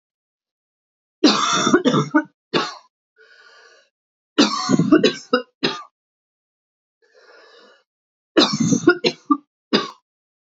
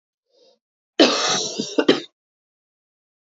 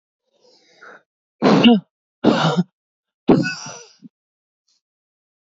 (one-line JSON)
{"three_cough_length": "10.5 s", "three_cough_amplitude": 28025, "three_cough_signal_mean_std_ratio": 0.39, "cough_length": "3.3 s", "cough_amplitude": 29393, "cough_signal_mean_std_ratio": 0.35, "exhalation_length": "5.5 s", "exhalation_amplitude": 31442, "exhalation_signal_mean_std_ratio": 0.34, "survey_phase": "beta (2021-08-13 to 2022-03-07)", "age": "18-44", "gender": "Female", "wearing_mask": "No", "symptom_sore_throat": true, "symptom_change_to_sense_of_smell_or_taste": true, "smoker_status": "Ex-smoker", "respiratory_condition_asthma": false, "respiratory_condition_other": false, "recruitment_source": "REACT", "submission_delay": "2 days", "covid_test_result": "Negative", "covid_test_method": "RT-qPCR", "influenza_a_test_result": "Negative", "influenza_b_test_result": "Negative"}